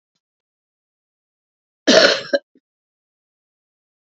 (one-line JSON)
{"cough_length": "4.1 s", "cough_amplitude": 30466, "cough_signal_mean_std_ratio": 0.23, "survey_phase": "beta (2021-08-13 to 2022-03-07)", "age": "65+", "gender": "Female", "wearing_mask": "No", "symptom_cough_any": true, "symptom_runny_or_blocked_nose": true, "symptom_change_to_sense_of_smell_or_taste": true, "smoker_status": "Never smoked", "respiratory_condition_asthma": false, "respiratory_condition_other": false, "recruitment_source": "Test and Trace", "submission_delay": "2 days", "covid_test_result": "Positive", "covid_test_method": "RT-qPCR", "covid_ct_value": 14.8, "covid_ct_gene": "ORF1ab gene", "covid_ct_mean": 15.1, "covid_viral_load": "11000000 copies/ml", "covid_viral_load_category": "High viral load (>1M copies/ml)"}